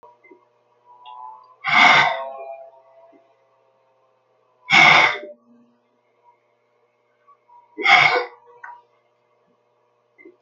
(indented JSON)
{
  "exhalation_length": "10.4 s",
  "exhalation_amplitude": 32282,
  "exhalation_signal_mean_std_ratio": 0.31,
  "survey_phase": "alpha (2021-03-01 to 2021-08-12)",
  "age": "65+",
  "gender": "Male",
  "wearing_mask": "No",
  "symptom_none": true,
  "smoker_status": "Never smoked",
  "respiratory_condition_asthma": false,
  "respiratory_condition_other": false,
  "recruitment_source": "REACT",
  "submission_delay": "2 days",
  "covid_test_result": "Negative",
  "covid_test_method": "RT-qPCR"
}